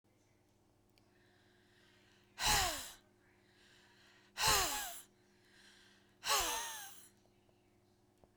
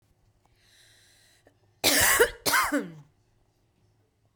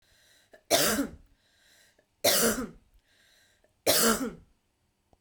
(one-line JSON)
{"exhalation_length": "8.4 s", "exhalation_amplitude": 4005, "exhalation_signal_mean_std_ratio": 0.36, "cough_length": "4.4 s", "cough_amplitude": 14303, "cough_signal_mean_std_ratio": 0.36, "three_cough_length": "5.2 s", "three_cough_amplitude": 12350, "three_cough_signal_mean_std_ratio": 0.4, "survey_phase": "beta (2021-08-13 to 2022-03-07)", "age": "45-64", "gender": "Female", "wearing_mask": "No", "symptom_none": true, "smoker_status": "Ex-smoker", "respiratory_condition_asthma": false, "respiratory_condition_other": false, "recruitment_source": "REACT", "submission_delay": "0 days", "covid_test_result": "Negative", "covid_test_method": "RT-qPCR", "influenza_a_test_result": "Unknown/Void", "influenza_b_test_result": "Unknown/Void"}